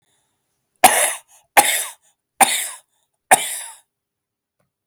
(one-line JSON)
{"cough_length": "4.9 s", "cough_amplitude": 32768, "cough_signal_mean_std_ratio": 0.32, "survey_phase": "alpha (2021-03-01 to 2021-08-12)", "age": "45-64", "gender": "Male", "wearing_mask": "No", "symptom_none": true, "smoker_status": "Never smoked", "respiratory_condition_asthma": true, "respiratory_condition_other": false, "recruitment_source": "REACT", "submission_delay": "2 days", "covid_test_method": "RT-qPCR"}